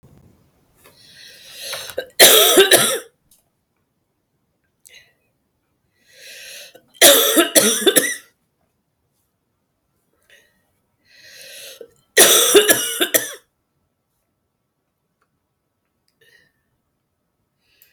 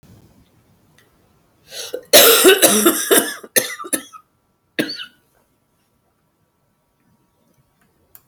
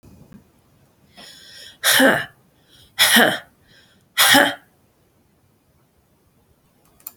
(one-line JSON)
{"three_cough_length": "17.9 s", "three_cough_amplitude": 32768, "three_cough_signal_mean_std_ratio": 0.31, "cough_length": "8.3 s", "cough_amplitude": 32768, "cough_signal_mean_std_ratio": 0.32, "exhalation_length": "7.2 s", "exhalation_amplitude": 32767, "exhalation_signal_mean_std_ratio": 0.33, "survey_phase": "alpha (2021-03-01 to 2021-08-12)", "age": "45-64", "gender": "Female", "wearing_mask": "No", "symptom_cough_any": true, "symptom_shortness_of_breath": true, "symptom_fatigue": true, "symptom_headache": true, "symptom_onset": "4 days", "smoker_status": "Ex-smoker", "respiratory_condition_asthma": false, "respiratory_condition_other": false, "recruitment_source": "Test and Trace", "submission_delay": "2 days", "covid_test_result": "Positive", "covid_test_method": "RT-qPCR", "covid_ct_value": 23.3, "covid_ct_gene": "ORF1ab gene"}